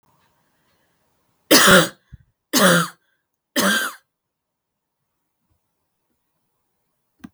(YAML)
three_cough_length: 7.3 s
three_cough_amplitude: 32768
three_cough_signal_mean_std_ratio: 0.29
survey_phase: beta (2021-08-13 to 2022-03-07)
age: 18-44
gender: Female
wearing_mask: 'No'
symptom_cough_any: true
symptom_shortness_of_breath: true
symptom_fatigue: true
symptom_fever_high_temperature: true
symptom_headache: true
symptom_other: true
symptom_onset: 2 days
smoker_status: Never smoked
respiratory_condition_asthma: true
respiratory_condition_other: false
recruitment_source: Test and Trace
submission_delay: 2 days
covid_test_result: Positive
covid_test_method: ePCR